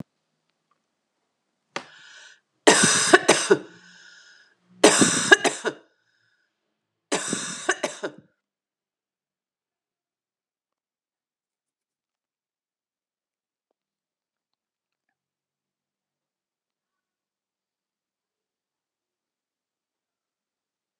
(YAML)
three_cough_length: 21.0 s
three_cough_amplitude: 32767
three_cough_signal_mean_std_ratio: 0.21
survey_phase: beta (2021-08-13 to 2022-03-07)
age: 45-64
gender: Female
wearing_mask: 'No'
symptom_cough_any: true
symptom_runny_or_blocked_nose: true
symptom_sore_throat: true
symptom_fatigue: true
symptom_onset: 6 days
smoker_status: Never smoked
respiratory_condition_asthma: false
respiratory_condition_other: false
recruitment_source: Test and Trace
submission_delay: 2 days
covid_test_result: Positive
covid_test_method: RT-qPCR
covid_ct_value: 15.9
covid_ct_gene: ORF1ab gene
covid_ct_mean: 16.2
covid_viral_load: 4800000 copies/ml
covid_viral_load_category: High viral load (>1M copies/ml)